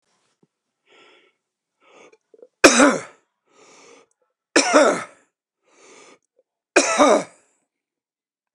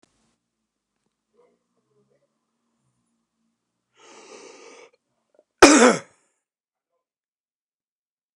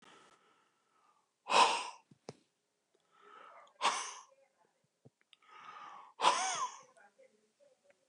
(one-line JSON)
{"three_cough_length": "8.5 s", "three_cough_amplitude": 30278, "three_cough_signal_mean_std_ratio": 0.28, "cough_length": "8.4 s", "cough_amplitude": 29676, "cough_signal_mean_std_ratio": 0.16, "exhalation_length": "8.1 s", "exhalation_amplitude": 7129, "exhalation_signal_mean_std_ratio": 0.3, "survey_phase": "beta (2021-08-13 to 2022-03-07)", "age": "65+", "gender": "Male", "wearing_mask": "No", "symptom_cough_any": true, "symptom_shortness_of_breath": true, "symptom_fatigue": true, "smoker_status": "Ex-smoker", "respiratory_condition_asthma": false, "respiratory_condition_other": false, "recruitment_source": "REACT", "submission_delay": "3 days", "covid_test_result": "Negative", "covid_test_method": "RT-qPCR", "influenza_a_test_result": "Negative", "influenza_b_test_result": "Negative"}